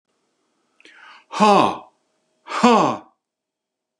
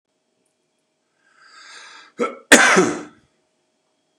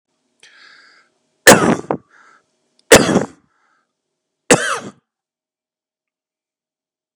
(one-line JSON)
{"exhalation_length": "4.0 s", "exhalation_amplitude": 29885, "exhalation_signal_mean_std_ratio": 0.35, "cough_length": "4.2 s", "cough_amplitude": 32768, "cough_signal_mean_std_ratio": 0.28, "three_cough_length": "7.2 s", "three_cough_amplitude": 32768, "three_cough_signal_mean_std_ratio": 0.25, "survey_phase": "beta (2021-08-13 to 2022-03-07)", "age": "45-64", "gender": "Male", "wearing_mask": "No", "symptom_none": true, "smoker_status": "Ex-smoker", "respiratory_condition_asthma": false, "respiratory_condition_other": false, "recruitment_source": "REACT", "submission_delay": "1 day", "covid_test_result": "Negative", "covid_test_method": "RT-qPCR", "influenza_a_test_result": "Negative", "influenza_b_test_result": "Negative"}